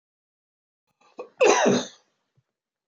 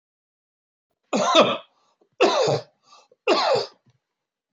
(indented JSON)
{
  "cough_length": "2.9 s",
  "cough_amplitude": 19964,
  "cough_signal_mean_std_ratio": 0.32,
  "three_cough_length": "4.5 s",
  "three_cough_amplitude": 21117,
  "three_cough_signal_mean_std_ratio": 0.42,
  "survey_phase": "beta (2021-08-13 to 2022-03-07)",
  "age": "45-64",
  "gender": "Male",
  "wearing_mask": "No",
  "symptom_none": true,
  "smoker_status": "Never smoked",
  "respiratory_condition_asthma": false,
  "respiratory_condition_other": false,
  "recruitment_source": "REACT",
  "submission_delay": "2 days",
  "covid_test_result": "Negative",
  "covid_test_method": "RT-qPCR"
}